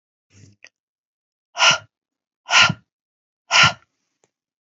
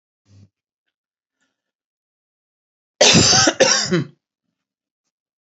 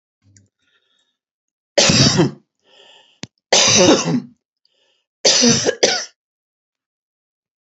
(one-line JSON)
{"exhalation_length": "4.7 s", "exhalation_amplitude": 29826, "exhalation_signal_mean_std_ratio": 0.28, "cough_length": "5.5 s", "cough_amplitude": 32768, "cough_signal_mean_std_ratio": 0.33, "three_cough_length": "7.8 s", "three_cough_amplitude": 32639, "three_cough_signal_mean_std_ratio": 0.4, "survey_phase": "beta (2021-08-13 to 2022-03-07)", "age": "45-64", "gender": "Female", "wearing_mask": "No", "symptom_none": true, "smoker_status": "Never smoked", "respiratory_condition_asthma": false, "respiratory_condition_other": false, "recruitment_source": "REACT", "submission_delay": "2 days", "covid_test_result": "Negative", "covid_test_method": "RT-qPCR", "influenza_a_test_result": "Unknown/Void", "influenza_b_test_result": "Unknown/Void"}